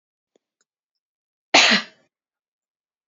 {"cough_length": "3.1 s", "cough_amplitude": 30311, "cough_signal_mean_std_ratio": 0.23, "survey_phase": "beta (2021-08-13 to 2022-03-07)", "age": "18-44", "gender": "Female", "wearing_mask": "No", "symptom_runny_or_blocked_nose": true, "smoker_status": "Never smoked", "respiratory_condition_asthma": false, "respiratory_condition_other": false, "recruitment_source": "REACT", "submission_delay": "1 day", "covid_test_result": "Negative", "covid_test_method": "RT-qPCR", "influenza_a_test_result": "Negative", "influenza_b_test_result": "Negative"}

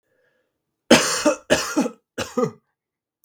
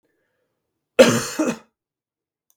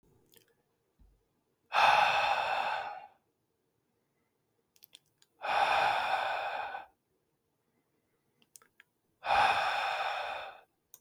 {"three_cough_length": "3.2 s", "three_cough_amplitude": 32766, "three_cough_signal_mean_std_ratio": 0.39, "cough_length": "2.6 s", "cough_amplitude": 32768, "cough_signal_mean_std_ratio": 0.28, "exhalation_length": "11.0 s", "exhalation_amplitude": 7983, "exhalation_signal_mean_std_ratio": 0.47, "survey_phase": "beta (2021-08-13 to 2022-03-07)", "age": "18-44", "gender": "Male", "wearing_mask": "No", "symptom_none": true, "smoker_status": "Ex-smoker", "respiratory_condition_asthma": false, "respiratory_condition_other": false, "recruitment_source": "REACT", "submission_delay": "2 days", "covid_test_result": "Negative", "covid_test_method": "RT-qPCR", "influenza_a_test_result": "Negative", "influenza_b_test_result": "Negative"}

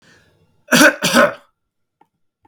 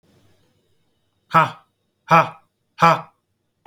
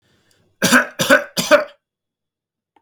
{"cough_length": "2.5 s", "cough_amplitude": 32233, "cough_signal_mean_std_ratio": 0.36, "exhalation_length": "3.7 s", "exhalation_amplitude": 27767, "exhalation_signal_mean_std_ratio": 0.28, "three_cough_length": "2.8 s", "three_cough_amplitude": 30524, "three_cough_signal_mean_std_ratio": 0.37, "survey_phase": "alpha (2021-03-01 to 2021-08-12)", "age": "18-44", "gender": "Male", "wearing_mask": "No", "symptom_none": true, "smoker_status": "Never smoked", "respiratory_condition_asthma": false, "respiratory_condition_other": false, "recruitment_source": "REACT", "submission_delay": "1 day", "covid_test_result": "Negative", "covid_test_method": "RT-qPCR"}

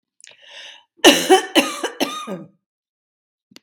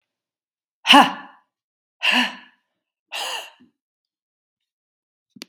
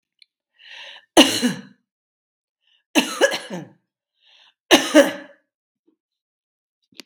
{"cough_length": "3.6 s", "cough_amplitude": 32768, "cough_signal_mean_std_ratio": 0.34, "exhalation_length": "5.5 s", "exhalation_amplitude": 32768, "exhalation_signal_mean_std_ratio": 0.24, "three_cough_length": "7.1 s", "three_cough_amplitude": 32768, "three_cough_signal_mean_std_ratio": 0.28, "survey_phase": "beta (2021-08-13 to 2022-03-07)", "age": "65+", "gender": "Female", "wearing_mask": "No", "symptom_none": true, "smoker_status": "Never smoked", "respiratory_condition_asthma": false, "respiratory_condition_other": false, "recruitment_source": "REACT", "submission_delay": "1 day", "covid_test_result": "Negative", "covid_test_method": "RT-qPCR"}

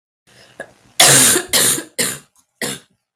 {"cough_length": "3.2 s", "cough_amplitude": 32768, "cough_signal_mean_std_ratio": 0.46, "survey_phase": "beta (2021-08-13 to 2022-03-07)", "age": "45-64", "gender": "Male", "wearing_mask": "No", "symptom_cough_any": true, "symptom_headache": true, "symptom_onset": "4 days", "smoker_status": "Ex-smoker", "respiratory_condition_asthma": false, "respiratory_condition_other": false, "recruitment_source": "Test and Trace", "submission_delay": "3 days", "covid_test_result": "Positive", "covid_test_method": "RT-qPCR"}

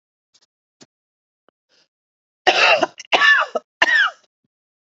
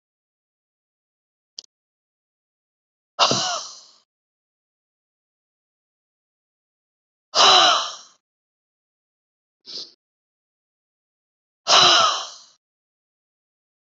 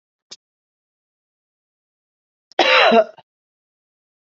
{"three_cough_length": "4.9 s", "three_cough_amplitude": 32767, "three_cough_signal_mean_std_ratio": 0.37, "exhalation_length": "14.0 s", "exhalation_amplitude": 29924, "exhalation_signal_mean_std_ratio": 0.25, "cough_length": "4.4 s", "cough_amplitude": 28669, "cough_signal_mean_std_ratio": 0.26, "survey_phase": "beta (2021-08-13 to 2022-03-07)", "age": "45-64", "gender": "Female", "wearing_mask": "No", "symptom_cough_any": true, "symptom_sore_throat": true, "smoker_status": "Never smoked", "respiratory_condition_asthma": true, "respiratory_condition_other": false, "recruitment_source": "Test and Trace", "submission_delay": "0 days", "covid_test_result": "Negative", "covid_test_method": "LFT"}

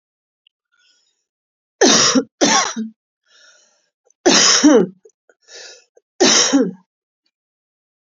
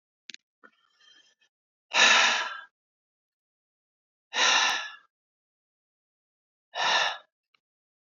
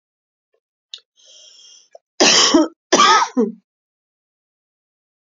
{"three_cough_length": "8.2 s", "three_cough_amplitude": 32768, "three_cough_signal_mean_std_ratio": 0.4, "exhalation_length": "8.2 s", "exhalation_amplitude": 15390, "exhalation_signal_mean_std_ratio": 0.33, "cough_length": "5.3 s", "cough_amplitude": 32768, "cough_signal_mean_std_ratio": 0.35, "survey_phase": "beta (2021-08-13 to 2022-03-07)", "age": "45-64", "gender": "Female", "wearing_mask": "No", "symptom_none": true, "smoker_status": "Never smoked", "respiratory_condition_asthma": false, "respiratory_condition_other": false, "recruitment_source": "REACT", "submission_delay": "1 day", "covid_test_result": "Negative", "covid_test_method": "RT-qPCR", "influenza_a_test_result": "Negative", "influenza_b_test_result": "Negative"}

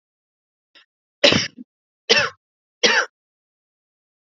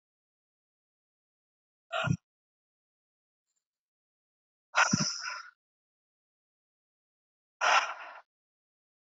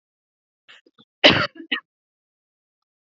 {"three_cough_length": "4.4 s", "three_cough_amplitude": 32767, "three_cough_signal_mean_std_ratio": 0.29, "exhalation_length": "9.0 s", "exhalation_amplitude": 9123, "exhalation_signal_mean_std_ratio": 0.25, "cough_length": "3.1 s", "cough_amplitude": 28668, "cough_signal_mean_std_ratio": 0.22, "survey_phase": "beta (2021-08-13 to 2022-03-07)", "age": "18-44", "gender": "Female", "wearing_mask": "No", "symptom_shortness_of_breath": true, "symptom_fatigue": true, "symptom_headache": true, "symptom_other": true, "symptom_onset": "3 days", "smoker_status": "Never smoked", "respiratory_condition_asthma": true, "respiratory_condition_other": false, "recruitment_source": "Test and Trace", "submission_delay": "2 days", "covid_test_result": "Positive", "covid_test_method": "RT-qPCR", "covid_ct_value": 29.7, "covid_ct_gene": "ORF1ab gene", "covid_ct_mean": 30.2, "covid_viral_load": "130 copies/ml", "covid_viral_load_category": "Minimal viral load (< 10K copies/ml)"}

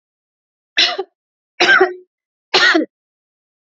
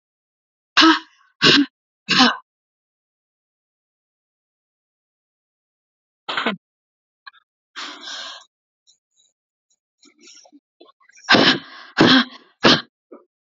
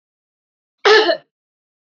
{"three_cough_length": "3.8 s", "three_cough_amplitude": 31757, "three_cough_signal_mean_std_ratio": 0.38, "exhalation_length": "13.6 s", "exhalation_amplitude": 32610, "exhalation_signal_mean_std_ratio": 0.28, "cough_length": "2.0 s", "cough_amplitude": 29733, "cough_signal_mean_std_ratio": 0.32, "survey_phase": "alpha (2021-03-01 to 2021-08-12)", "age": "45-64", "gender": "Female", "wearing_mask": "No", "symptom_none": true, "smoker_status": "Ex-smoker", "respiratory_condition_asthma": false, "respiratory_condition_other": false, "recruitment_source": "REACT", "submission_delay": "3 days", "covid_test_result": "Negative", "covid_test_method": "RT-qPCR"}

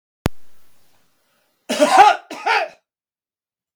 {"cough_length": "3.8 s", "cough_amplitude": 32768, "cough_signal_mean_std_ratio": 0.36, "survey_phase": "beta (2021-08-13 to 2022-03-07)", "age": "65+", "gender": "Male", "wearing_mask": "No", "symptom_none": true, "smoker_status": "Never smoked", "respiratory_condition_asthma": false, "respiratory_condition_other": false, "recruitment_source": "REACT", "submission_delay": "1 day", "covid_test_result": "Negative", "covid_test_method": "RT-qPCR"}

